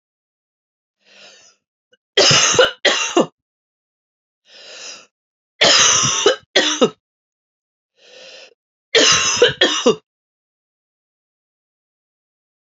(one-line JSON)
{"three_cough_length": "12.7 s", "three_cough_amplitude": 32611, "three_cough_signal_mean_std_ratio": 0.38, "survey_phase": "beta (2021-08-13 to 2022-03-07)", "age": "45-64", "gender": "Female", "wearing_mask": "No", "symptom_runny_or_blocked_nose": true, "symptom_headache": true, "symptom_change_to_sense_of_smell_or_taste": true, "symptom_onset": "4 days", "smoker_status": "Never smoked", "respiratory_condition_asthma": false, "respiratory_condition_other": false, "recruitment_source": "Test and Trace", "submission_delay": "2 days", "covid_test_result": "Positive", "covid_test_method": "ePCR"}